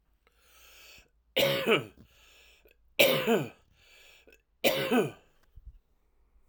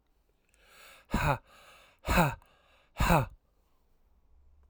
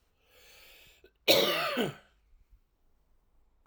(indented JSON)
{
  "three_cough_length": "6.5 s",
  "three_cough_amplitude": 18273,
  "three_cough_signal_mean_std_ratio": 0.38,
  "exhalation_length": "4.7 s",
  "exhalation_amplitude": 10663,
  "exhalation_signal_mean_std_ratio": 0.34,
  "cough_length": "3.7 s",
  "cough_amplitude": 11547,
  "cough_signal_mean_std_ratio": 0.33,
  "survey_phase": "alpha (2021-03-01 to 2021-08-12)",
  "age": "45-64",
  "gender": "Male",
  "wearing_mask": "No",
  "symptom_cough_any": true,
  "symptom_fatigue": true,
  "smoker_status": "Ex-smoker",
  "respiratory_condition_asthma": false,
  "respiratory_condition_other": false,
  "recruitment_source": "Test and Trace",
  "submission_delay": "2 days",
  "covid_test_result": "Positive",
  "covid_test_method": "RT-qPCR",
  "covid_ct_value": 16.2,
  "covid_ct_gene": "ORF1ab gene",
  "covid_ct_mean": 16.5,
  "covid_viral_load": "3900000 copies/ml",
  "covid_viral_load_category": "High viral load (>1M copies/ml)"
}